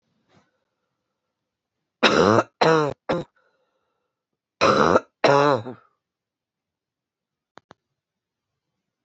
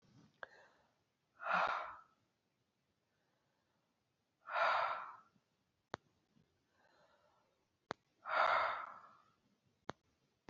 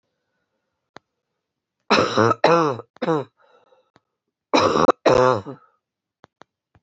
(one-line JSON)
{"cough_length": "9.0 s", "cough_amplitude": 26958, "cough_signal_mean_std_ratio": 0.31, "exhalation_length": "10.5 s", "exhalation_amplitude": 2805, "exhalation_signal_mean_std_ratio": 0.32, "three_cough_length": "6.8 s", "three_cough_amplitude": 25261, "three_cough_signal_mean_std_ratio": 0.36, "survey_phase": "beta (2021-08-13 to 2022-03-07)", "age": "45-64", "gender": "Female", "wearing_mask": "No", "symptom_cough_any": true, "symptom_new_continuous_cough": true, "symptom_runny_or_blocked_nose": true, "symptom_shortness_of_breath": true, "symptom_sore_throat": true, "symptom_fatigue": true, "symptom_fever_high_temperature": true, "symptom_headache": true, "symptom_change_to_sense_of_smell_or_taste": true, "symptom_onset": "3 days", "smoker_status": "Never smoked", "respiratory_condition_asthma": false, "respiratory_condition_other": false, "recruitment_source": "Test and Trace", "submission_delay": "1 day", "covid_test_result": "Positive", "covid_test_method": "RT-qPCR", "covid_ct_value": 20.6, "covid_ct_gene": "N gene"}